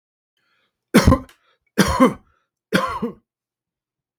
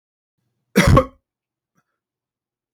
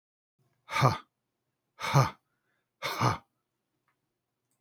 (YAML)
three_cough_length: 4.2 s
three_cough_amplitude: 32768
three_cough_signal_mean_std_ratio: 0.32
cough_length: 2.7 s
cough_amplitude: 32768
cough_signal_mean_std_ratio: 0.25
exhalation_length: 4.6 s
exhalation_amplitude: 14546
exhalation_signal_mean_std_ratio: 0.3
survey_phase: beta (2021-08-13 to 2022-03-07)
age: 45-64
gender: Male
wearing_mask: 'No'
symptom_none: true
smoker_status: Ex-smoker
respiratory_condition_asthma: false
respiratory_condition_other: false
recruitment_source: REACT
submission_delay: 2 days
covid_test_result: Negative
covid_test_method: RT-qPCR
influenza_a_test_result: Negative
influenza_b_test_result: Negative